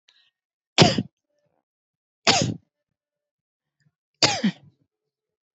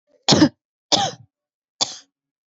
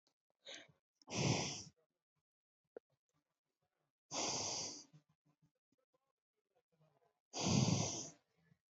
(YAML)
three_cough_length: 5.5 s
three_cough_amplitude: 27489
three_cough_signal_mean_std_ratio: 0.26
cough_length: 2.6 s
cough_amplitude: 28083
cough_signal_mean_std_ratio: 0.32
exhalation_length: 8.7 s
exhalation_amplitude: 2753
exhalation_signal_mean_std_ratio: 0.36
survey_phase: alpha (2021-03-01 to 2021-08-12)
age: 45-64
gender: Female
wearing_mask: 'Yes'
symptom_none: true
smoker_status: Never smoked
respiratory_condition_asthma: false
respiratory_condition_other: false
recruitment_source: REACT
submission_delay: 3 days
covid_test_result: Negative
covid_test_method: RT-qPCR